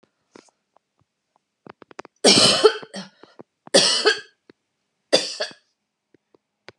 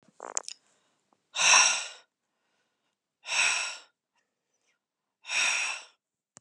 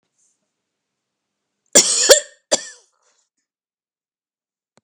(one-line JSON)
{"three_cough_length": "6.8 s", "three_cough_amplitude": 32655, "three_cough_signal_mean_std_ratio": 0.31, "exhalation_length": "6.4 s", "exhalation_amplitude": 15563, "exhalation_signal_mean_std_ratio": 0.35, "cough_length": "4.8 s", "cough_amplitude": 32768, "cough_signal_mean_std_ratio": 0.23, "survey_phase": "beta (2021-08-13 to 2022-03-07)", "age": "45-64", "gender": "Female", "wearing_mask": "No", "symptom_none": true, "smoker_status": "Ex-smoker", "respiratory_condition_asthma": false, "respiratory_condition_other": false, "recruitment_source": "REACT", "submission_delay": "12 days", "covid_test_result": "Negative", "covid_test_method": "RT-qPCR"}